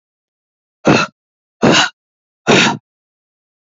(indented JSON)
{
  "exhalation_length": "3.8 s",
  "exhalation_amplitude": 30504,
  "exhalation_signal_mean_std_ratio": 0.36,
  "survey_phase": "beta (2021-08-13 to 2022-03-07)",
  "age": "18-44",
  "gender": "Female",
  "wearing_mask": "No",
  "symptom_cough_any": true,
  "symptom_runny_or_blocked_nose": true,
  "symptom_sore_throat": true,
  "symptom_headache": true,
  "symptom_change_to_sense_of_smell_or_taste": true,
  "symptom_other": true,
  "symptom_onset": "4 days",
  "smoker_status": "Never smoked",
  "respiratory_condition_asthma": false,
  "respiratory_condition_other": false,
  "recruitment_source": "Test and Trace",
  "submission_delay": "2 days",
  "covid_test_result": "Positive",
  "covid_test_method": "RT-qPCR",
  "covid_ct_value": 19.9,
  "covid_ct_gene": "ORF1ab gene",
  "covid_ct_mean": 20.3,
  "covid_viral_load": "220000 copies/ml",
  "covid_viral_load_category": "Low viral load (10K-1M copies/ml)"
}